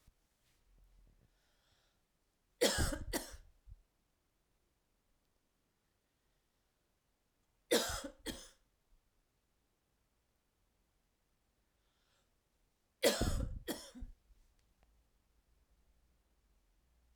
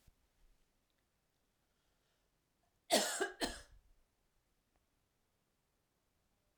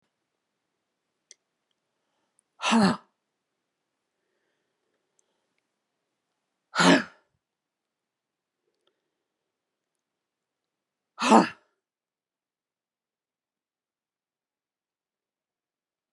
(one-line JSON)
{"three_cough_length": "17.2 s", "three_cough_amplitude": 4092, "three_cough_signal_mean_std_ratio": 0.25, "cough_length": "6.6 s", "cough_amplitude": 4226, "cough_signal_mean_std_ratio": 0.22, "exhalation_length": "16.1 s", "exhalation_amplitude": 25415, "exhalation_signal_mean_std_ratio": 0.17, "survey_phase": "alpha (2021-03-01 to 2021-08-12)", "age": "65+", "gender": "Female", "wearing_mask": "No", "symptom_headache": true, "symptom_onset": "5 days", "smoker_status": "Never smoked", "respiratory_condition_asthma": false, "respiratory_condition_other": false, "recruitment_source": "Test and Trace", "submission_delay": "2 days", "covid_test_result": "Positive", "covid_test_method": "RT-qPCR", "covid_ct_value": 34.0, "covid_ct_gene": "N gene"}